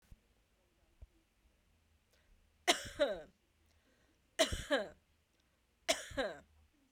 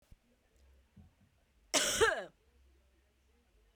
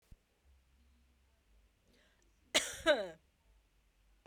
{"three_cough_length": "6.9 s", "three_cough_amplitude": 6675, "three_cough_signal_mean_std_ratio": 0.3, "cough_length": "3.8 s", "cough_amplitude": 5465, "cough_signal_mean_std_ratio": 0.3, "exhalation_length": "4.3 s", "exhalation_amplitude": 5223, "exhalation_signal_mean_std_ratio": 0.23, "survey_phase": "beta (2021-08-13 to 2022-03-07)", "age": "45-64", "gender": "Female", "wearing_mask": "No", "symptom_cough_any": true, "symptom_onset": "3 days", "smoker_status": "Never smoked", "respiratory_condition_asthma": false, "respiratory_condition_other": false, "recruitment_source": "Test and Trace", "submission_delay": "2 days", "covid_test_result": "Positive", "covid_test_method": "RT-qPCR", "covid_ct_value": 22.5, "covid_ct_gene": "ORF1ab gene"}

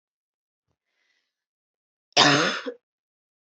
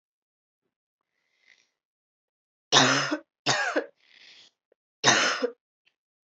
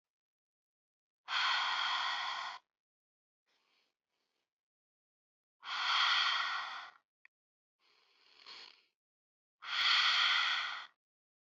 {"cough_length": "3.4 s", "cough_amplitude": 27027, "cough_signal_mean_std_ratio": 0.27, "three_cough_length": "6.3 s", "three_cough_amplitude": 25732, "three_cough_signal_mean_std_ratio": 0.33, "exhalation_length": "11.5 s", "exhalation_amplitude": 4267, "exhalation_signal_mean_std_ratio": 0.45, "survey_phase": "beta (2021-08-13 to 2022-03-07)", "age": "18-44", "gender": "Female", "wearing_mask": "No", "symptom_runny_or_blocked_nose": true, "symptom_sore_throat": true, "symptom_fatigue": true, "symptom_other": true, "symptom_onset": "3 days", "smoker_status": "Never smoked", "respiratory_condition_asthma": true, "respiratory_condition_other": false, "recruitment_source": "Test and Trace", "submission_delay": "1 day", "covid_test_result": "Positive", "covid_test_method": "RT-qPCR", "covid_ct_value": 15.2, "covid_ct_gene": "ORF1ab gene"}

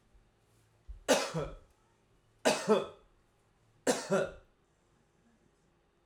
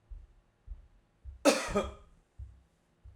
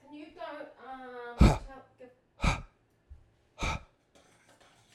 {"three_cough_length": "6.1 s", "three_cough_amplitude": 7417, "three_cough_signal_mean_std_ratio": 0.34, "cough_length": "3.2 s", "cough_amplitude": 11640, "cough_signal_mean_std_ratio": 0.31, "exhalation_length": "4.9 s", "exhalation_amplitude": 13063, "exhalation_signal_mean_std_ratio": 0.29, "survey_phase": "alpha (2021-03-01 to 2021-08-12)", "age": "45-64", "gender": "Male", "wearing_mask": "No", "symptom_none": true, "smoker_status": "Ex-smoker", "respiratory_condition_asthma": false, "respiratory_condition_other": false, "recruitment_source": "REACT", "submission_delay": "2 days", "covid_test_result": "Negative", "covid_test_method": "RT-qPCR"}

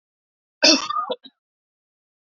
{"cough_length": "2.3 s", "cough_amplitude": 27275, "cough_signal_mean_std_ratio": 0.3, "survey_phase": "beta (2021-08-13 to 2022-03-07)", "age": "45-64", "gender": "Female", "wearing_mask": "No", "symptom_none": true, "symptom_onset": "5 days", "smoker_status": "Ex-smoker", "respiratory_condition_asthma": true, "respiratory_condition_other": false, "recruitment_source": "REACT", "submission_delay": "3 days", "covid_test_result": "Negative", "covid_test_method": "RT-qPCR", "influenza_a_test_result": "Negative", "influenza_b_test_result": "Negative"}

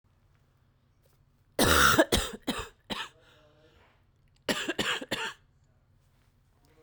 {"cough_length": "6.8 s", "cough_amplitude": 13637, "cough_signal_mean_std_ratio": 0.35, "survey_phase": "beta (2021-08-13 to 2022-03-07)", "age": "18-44", "gender": "Female", "wearing_mask": "No", "symptom_cough_any": true, "symptom_new_continuous_cough": true, "symptom_runny_or_blocked_nose": true, "symptom_fatigue": true, "symptom_fever_high_temperature": true, "symptom_headache": true, "symptom_change_to_sense_of_smell_or_taste": true, "symptom_loss_of_taste": true, "symptom_onset": "3 days", "smoker_status": "Never smoked", "respiratory_condition_asthma": false, "respiratory_condition_other": false, "recruitment_source": "Test and Trace", "submission_delay": "2 days", "covid_test_result": "Positive", "covid_test_method": "RT-qPCR", "covid_ct_value": 27.5, "covid_ct_gene": "N gene"}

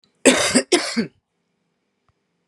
{"cough_length": "2.5 s", "cough_amplitude": 32672, "cough_signal_mean_std_ratio": 0.37, "survey_phase": "beta (2021-08-13 to 2022-03-07)", "age": "45-64", "gender": "Female", "wearing_mask": "No", "symptom_cough_any": true, "symptom_runny_or_blocked_nose": true, "symptom_abdominal_pain": true, "symptom_diarrhoea": true, "symptom_headache": true, "symptom_other": true, "smoker_status": "Ex-smoker", "respiratory_condition_asthma": false, "respiratory_condition_other": false, "recruitment_source": "Test and Trace", "submission_delay": "2 days", "covid_test_result": "Positive", "covid_test_method": "RT-qPCR", "covid_ct_value": 19.3, "covid_ct_gene": "ORF1ab gene"}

